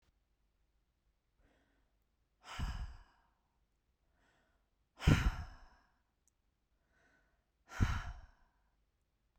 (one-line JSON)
{"exhalation_length": "9.4 s", "exhalation_amplitude": 5954, "exhalation_signal_mean_std_ratio": 0.24, "survey_phase": "beta (2021-08-13 to 2022-03-07)", "age": "18-44", "gender": "Female", "wearing_mask": "No", "symptom_none": true, "smoker_status": "Never smoked", "respiratory_condition_asthma": false, "respiratory_condition_other": false, "recruitment_source": "REACT", "submission_delay": "11 days", "covid_test_result": "Negative", "covid_test_method": "RT-qPCR"}